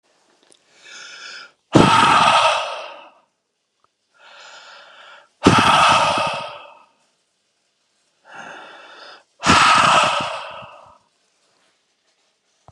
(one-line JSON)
{"exhalation_length": "12.7 s", "exhalation_amplitude": 32768, "exhalation_signal_mean_std_ratio": 0.41, "survey_phase": "beta (2021-08-13 to 2022-03-07)", "age": "45-64", "gender": "Male", "wearing_mask": "No", "symptom_none": true, "smoker_status": "Ex-smoker", "respiratory_condition_asthma": false, "respiratory_condition_other": false, "recruitment_source": "REACT", "submission_delay": "1 day", "covid_test_result": "Negative", "covid_test_method": "RT-qPCR", "influenza_a_test_result": "Unknown/Void", "influenza_b_test_result": "Unknown/Void"}